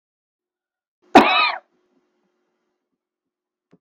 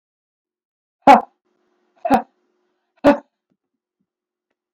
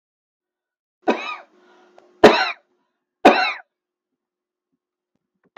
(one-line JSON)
{"cough_length": "3.8 s", "cough_amplitude": 32768, "cough_signal_mean_std_ratio": 0.23, "exhalation_length": "4.7 s", "exhalation_amplitude": 32768, "exhalation_signal_mean_std_ratio": 0.21, "three_cough_length": "5.6 s", "three_cough_amplitude": 32768, "three_cough_signal_mean_std_ratio": 0.24, "survey_phase": "beta (2021-08-13 to 2022-03-07)", "age": "65+", "gender": "Female", "wearing_mask": "No", "symptom_shortness_of_breath": true, "smoker_status": "Ex-smoker", "respiratory_condition_asthma": true, "respiratory_condition_other": false, "recruitment_source": "REACT", "submission_delay": "0 days", "covid_test_result": "Negative", "covid_test_method": "RT-qPCR"}